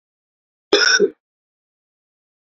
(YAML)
cough_length: 2.5 s
cough_amplitude: 29371
cough_signal_mean_std_ratio: 0.3
survey_phase: beta (2021-08-13 to 2022-03-07)
age: 45-64
gender: Male
wearing_mask: 'No'
symptom_cough_any: true
symptom_runny_or_blocked_nose: true
symptom_onset: 4 days
smoker_status: Ex-smoker
respiratory_condition_asthma: false
respiratory_condition_other: false
recruitment_source: Test and Trace
submission_delay: 2 days
covid_test_result: Positive
covid_test_method: ePCR